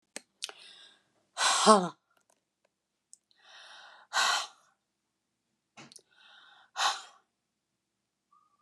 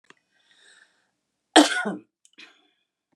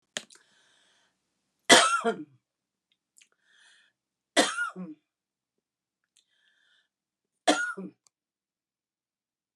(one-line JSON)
{"exhalation_length": "8.6 s", "exhalation_amplitude": 17594, "exhalation_signal_mean_std_ratio": 0.26, "cough_length": "3.2 s", "cough_amplitude": 29977, "cough_signal_mean_std_ratio": 0.21, "three_cough_length": "9.6 s", "three_cough_amplitude": 30782, "three_cough_signal_mean_std_ratio": 0.23, "survey_phase": "alpha (2021-03-01 to 2021-08-12)", "age": "65+", "gender": "Female", "wearing_mask": "No", "symptom_none": true, "smoker_status": "Ex-smoker", "respiratory_condition_asthma": false, "respiratory_condition_other": false, "recruitment_source": "REACT", "submission_delay": "1 day", "covid_test_result": "Negative", "covid_test_method": "RT-qPCR"}